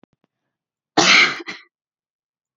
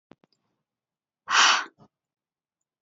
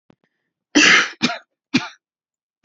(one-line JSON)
{"cough_length": "2.6 s", "cough_amplitude": 28733, "cough_signal_mean_std_ratio": 0.31, "exhalation_length": "2.8 s", "exhalation_amplitude": 15628, "exhalation_signal_mean_std_ratio": 0.27, "three_cough_length": "2.6 s", "three_cough_amplitude": 30730, "three_cough_signal_mean_std_ratio": 0.35, "survey_phase": "alpha (2021-03-01 to 2021-08-12)", "age": "18-44", "gender": "Female", "wearing_mask": "No", "symptom_shortness_of_breath": true, "symptom_fatigue": true, "symptom_onset": "13 days", "smoker_status": "Never smoked", "respiratory_condition_asthma": false, "respiratory_condition_other": false, "recruitment_source": "REACT", "submission_delay": "1 day", "covid_test_result": "Negative", "covid_test_method": "RT-qPCR"}